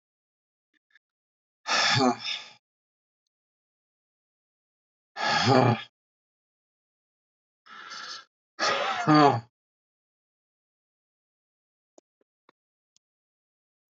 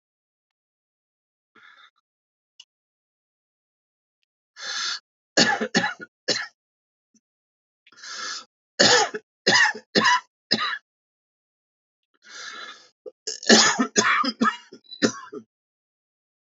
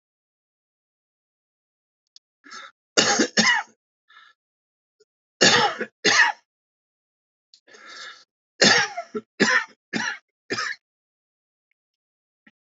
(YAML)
exhalation_length: 13.9 s
exhalation_amplitude: 17446
exhalation_signal_mean_std_ratio: 0.29
three_cough_length: 16.6 s
three_cough_amplitude: 27674
three_cough_signal_mean_std_ratio: 0.33
cough_length: 12.6 s
cough_amplitude: 28479
cough_signal_mean_std_ratio: 0.32
survey_phase: alpha (2021-03-01 to 2021-08-12)
age: 65+
gender: Male
wearing_mask: 'No'
symptom_new_continuous_cough: true
symptom_shortness_of_breath: true
symptom_fatigue: true
symptom_change_to_sense_of_smell_or_taste: true
symptom_onset: 12 days
smoker_status: Ex-smoker
respiratory_condition_asthma: true
respiratory_condition_other: true
recruitment_source: REACT
submission_delay: 0 days
covid_test_result: Negative
covid_test_method: RT-qPCR